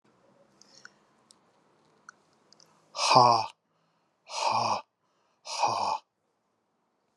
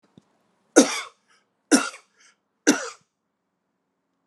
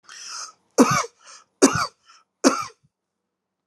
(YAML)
exhalation_length: 7.2 s
exhalation_amplitude: 21775
exhalation_signal_mean_std_ratio: 0.32
three_cough_length: 4.3 s
three_cough_amplitude: 31601
three_cough_signal_mean_std_ratio: 0.24
cough_length: 3.7 s
cough_amplitude: 30370
cough_signal_mean_std_ratio: 0.33
survey_phase: alpha (2021-03-01 to 2021-08-12)
age: 45-64
gender: Male
wearing_mask: 'No'
symptom_none: true
smoker_status: Ex-smoker
respiratory_condition_asthma: false
respiratory_condition_other: false
recruitment_source: REACT
submission_delay: 1 day
covid_test_result: Negative
covid_test_method: RT-qPCR